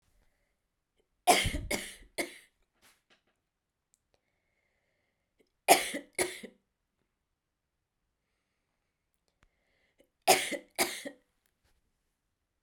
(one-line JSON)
{"three_cough_length": "12.6 s", "three_cough_amplitude": 17245, "three_cough_signal_mean_std_ratio": 0.22, "survey_phase": "beta (2021-08-13 to 2022-03-07)", "age": "45-64", "gender": "Female", "wearing_mask": "No", "symptom_runny_or_blocked_nose": true, "symptom_shortness_of_breath": true, "symptom_fatigue": true, "symptom_headache": true, "symptom_change_to_sense_of_smell_or_taste": true, "symptom_loss_of_taste": true, "symptom_onset": "3 days", "smoker_status": "Never smoked", "respiratory_condition_asthma": false, "respiratory_condition_other": false, "recruitment_source": "Test and Trace", "submission_delay": "2 days", "covid_test_result": "Positive", "covid_test_method": "RT-qPCR"}